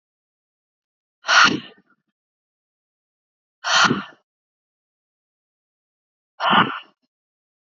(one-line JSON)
{"exhalation_length": "7.7 s", "exhalation_amplitude": 29853, "exhalation_signal_mean_std_ratio": 0.27, "survey_phase": "alpha (2021-03-01 to 2021-08-12)", "age": "18-44", "gender": "Female", "wearing_mask": "No", "symptom_change_to_sense_of_smell_or_taste": true, "symptom_loss_of_taste": true, "symptom_onset": "2 days", "smoker_status": "Never smoked", "respiratory_condition_asthma": false, "respiratory_condition_other": false, "recruitment_source": "Test and Trace", "submission_delay": "2 days", "covid_test_result": "Positive", "covid_test_method": "RT-qPCR"}